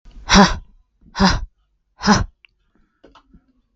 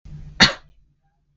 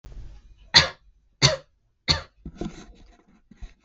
{"exhalation_length": "3.8 s", "exhalation_amplitude": 32768, "exhalation_signal_mean_std_ratio": 0.34, "cough_length": "1.4 s", "cough_amplitude": 32768, "cough_signal_mean_std_ratio": 0.26, "three_cough_length": "3.8 s", "three_cough_amplitude": 32768, "three_cough_signal_mean_std_ratio": 0.28, "survey_phase": "beta (2021-08-13 to 2022-03-07)", "age": "18-44", "gender": "Female", "wearing_mask": "No", "symptom_cough_any": true, "symptom_runny_or_blocked_nose": true, "symptom_sore_throat": true, "symptom_onset": "3 days", "smoker_status": "Never smoked", "respiratory_condition_asthma": false, "respiratory_condition_other": false, "recruitment_source": "Test and Trace", "submission_delay": "2 days", "covid_test_result": "Positive", "covid_test_method": "RT-qPCR", "covid_ct_value": 26.8, "covid_ct_gene": "N gene"}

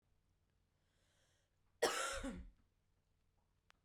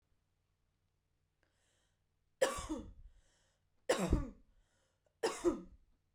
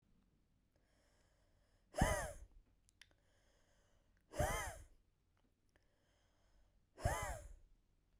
{"cough_length": "3.8 s", "cough_amplitude": 2460, "cough_signal_mean_std_ratio": 0.3, "three_cough_length": "6.1 s", "three_cough_amplitude": 4656, "three_cough_signal_mean_std_ratio": 0.31, "exhalation_length": "8.2 s", "exhalation_amplitude": 2896, "exhalation_signal_mean_std_ratio": 0.31, "survey_phase": "beta (2021-08-13 to 2022-03-07)", "age": "45-64", "gender": "Female", "wearing_mask": "No", "symptom_cough_any": true, "symptom_runny_or_blocked_nose": true, "symptom_fatigue": true, "symptom_headache": true, "smoker_status": "Never smoked", "respiratory_condition_asthma": false, "respiratory_condition_other": false, "recruitment_source": "Test and Trace", "submission_delay": "2 days", "covid_test_result": "Positive", "covid_test_method": "RT-qPCR"}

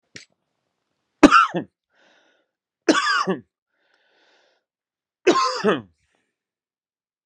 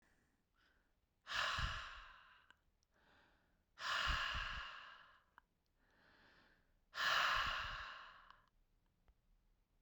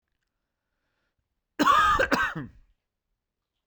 {"three_cough_length": "7.3 s", "three_cough_amplitude": 32768, "three_cough_signal_mean_std_ratio": 0.29, "exhalation_length": "9.8 s", "exhalation_amplitude": 2066, "exhalation_signal_mean_std_ratio": 0.44, "cough_length": "3.7 s", "cough_amplitude": 13097, "cough_signal_mean_std_ratio": 0.37, "survey_phase": "beta (2021-08-13 to 2022-03-07)", "age": "18-44", "gender": "Male", "wearing_mask": "No", "symptom_cough_any": true, "symptom_sore_throat": true, "smoker_status": "Never smoked", "respiratory_condition_asthma": false, "respiratory_condition_other": false, "recruitment_source": "Test and Trace", "submission_delay": "2 days", "covid_test_result": "Positive", "covid_test_method": "LAMP"}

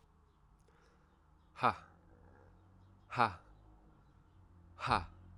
{"exhalation_length": "5.4 s", "exhalation_amplitude": 5700, "exhalation_signal_mean_std_ratio": 0.27, "survey_phase": "alpha (2021-03-01 to 2021-08-12)", "age": "18-44", "gender": "Male", "wearing_mask": "No", "symptom_cough_any": true, "symptom_fever_high_temperature": true, "smoker_status": "Prefer not to say", "respiratory_condition_asthma": false, "respiratory_condition_other": false, "recruitment_source": "Test and Trace", "submission_delay": "2 days", "covid_test_result": "Positive", "covid_test_method": "LFT"}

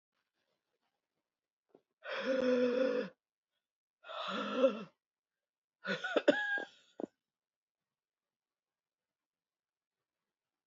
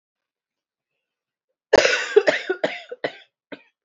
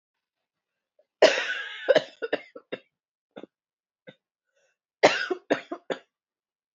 {"exhalation_length": "10.7 s", "exhalation_amplitude": 6781, "exhalation_signal_mean_std_ratio": 0.35, "three_cough_length": "3.8 s", "three_cough_amplitude": 27255, "three_cough_signal_mean_std_ratio": 0.31, "cough_length": "6.7 s", "cough_amplitude": 23165, "cough_signal_mean_std_ratio": 0.27, "survey_phase": "beta (2021-08-13 to 2022-03-07)", "age": "18-44", "gender": "Female", "wearing_mask": "No", "symptom_cough_any": true, "symptom_new_continuous_cough": true, "symptom_runny_or_blocked_nose": true, "symptom_shortness_of_breath": true, "symptom_sore_throat": true, "symptom_fatigue": true, "symptom_fever_high_temperature": true, "symptom_headache": true, "symptom_change_to_sense_of_smell_or_taste": true, "symptom_loss_of_taste": true, "symptom_other": true, "symptom_onset": "7 days", "smoker_status": "Ex-smoker", "respiratory_condition_asthma": false, "respiratory_condition_other": false, "recruitment_source": "Test and Trace", "submission_delay": "1 day", "covid_test_result": "Positive", "covid_test_method": "RT-qPCR", "covid_ct_value": 19.8, "covid_ct_gene": "ORF1ab gene"}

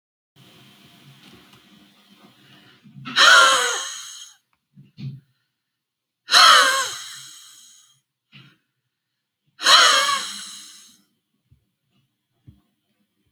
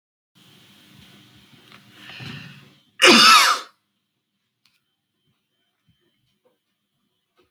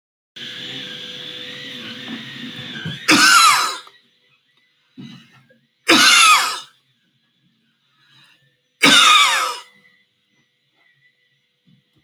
{"exhalation_length": "13.3 s", "exhalation_amplitude": 29615, "exhalation_signal_mean_std_ratio": 0.31, "cough_length": "7.5 s", "cough_amplitude": 32571, "cough_signal_mean_std_ratio": 0.24, "three_cough_length": "12.0 s", "three_cough_amplitude": 32768, "three_cough_signal_mean_std_ratio": 0.39, "survey_phase": "alpha (2021-03-01 to 2021-08-12)", "age": "45-64", "gender": "Male", "wearing_mask": "No", "symptom_none": true, "smoker_status": "Ex-smoker", "respiratory_condition_asthma": false, "respiratory_condition_other": false, "recruitment_source": "Test and Trace", "submission_delay": "0 days", "covid_test_result": "Negative", "covid_test_method": "LFT"}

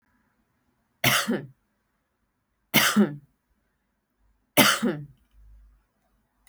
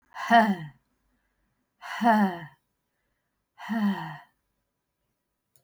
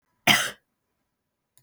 {"three_cough_length": "6.5 s", "three_cough_amplitude": 27900, "three_cough_signal_mean_std_ratio": 0.32, "exhalation_length": "5.6 s", "exhalation_amplitude": 15266, "exhalation_signal_mean_std_ratio": 0.36, "cough_length": "1.6 s", "cough_amplitude": 23355, "cough_signal_mean_std_ratio": 0.26, "survey_phase": "beta (2021-08-13 to 2022-03-07)", "age": "45-64", "gender": "Female", "wearing_mask": "No", "symptom_cough_any": true, "symptom_runny_or_blocked_nose": true, "symptom_shortness_of_breath": true, "symptom_headache": true, "symptom_change_to_sense_of_smell_or_taste": true, "smoker_status": "Never smoked", "respiratory_condition_asthma": false, "respiratory_condition_other": false, "recruitment_source": "Test and Trace", "submission_delay": "4 days", "covid_test_result": "Positive", "covid_test_method": "RT-qPCR"}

